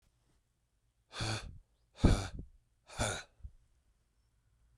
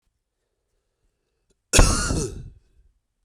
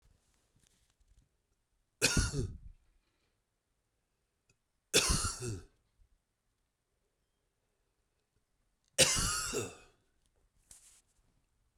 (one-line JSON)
{"exhalation_length": "4.8 s", "exhalation_amplitude": 7256, "exhalation_signal_mean_std_ratio": 0.29, "cough_length": "3.2 s", "cough_amplitude": 32039, "cough_signal_mean_std_ratio": 0.3, "three_cough_length": "11.8 s", "three_cough_amplitude": 8728, "three_cough_signal_mean_std_ratio": 0.29, "survey_phase": "beta (2021-08-13 to 2022-03-07)", "age": "45-64", "gender": "Male", "wearing_mask": "No", "symptom_cough_any": true, "symptom_new_continuous_cough": true, "symptom_runny_or_blocked_nose": true, "symptom_shortness_of_breath": true, "symptom_sore_throat": true, "symptom_fatigue": true, "symptom_headache": true, "symptom_change_to_sense_of_smell_or_taste": true, "symptom_onset": "4 days", "smoker_status": "Ex-smoker", "respiratory_condition_asthma": false, "respiratory_condition_other": false, "recruitment_source": "Test and Trace", "submission_delay": "2 days", "covid_test_result": "Positive", "covid_test_method": "RT-qPCR", "covid_ct_value": 21.2, "covid_ct_gene": "ORF1ab gene", "covid_ct_mean": 21.7, "covid_viral_load": "78000 copies/ml", "covid_viral_load_category": "Low viral load (10K-1M copies/ml)"}